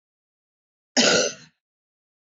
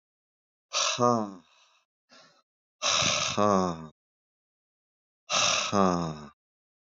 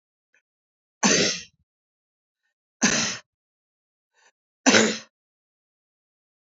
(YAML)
cough_length: 2.3 s
cough_amplitude: 17984
cough_signal_mean_std_ratio: 0.31
exhalation_length: 6.9 s
exhalation_amplitude: 12956
exhalation_signal_mean_std_ratio: 0.45
three_cough_length: 6.6 s
three_cough_amplitude: 26350
three_cough_signal_mean_std_ratio: 0.29
survey_phase: beta (2021-08-13 to 2022-03-07)
age: 45-64
gender: Male
wearing_mask: 'No'
symptom_cough_any: true
symptom_runny_or_blocked_nose: true
symptom_sore_throat: true
symptom_fatigue: true
symptom_onset: 3 days
smoker_status: Never smoked
respiratory_condition_asthma: false
respiratory_condition_other: false
recruitment_source: Test and Trace
submission_delay: 1 day
covid_test_result: Positive
covid_test_method: RT-qPCR